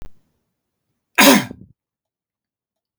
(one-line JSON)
{"cough_length": "3.0 s", "cough_amplitude": 32768, "cough_signal_mean_std_ratio": 0.25, "survey_phase": "beta (2021-08-13 to 2022-03-07)", "age": "18-44", "gender": "Male", "wearing_mask": "No", "symptom_runny_or_blocked_nose": true, "symptom_change_to_sense_of_smell_or_taste": true, "smoker_status": "Never smoked", "respiratory_condition_asthma": false, "respiratory_condition_other": false, "recruitment_source": "Test and Trace", "submission_delay": "2 days", "covid_test_result": "Positive", "covid_test_method": "RT-qPCR", "covid_ct_value": 31.2, "covid_ct_gene": "ORF1ab gene", "covid_ct_mean": 33.1, "covid_viral_load": "14 copies/ml", "covid_viral_load_category": "Minimal viral load (< 10K copies/ml)"}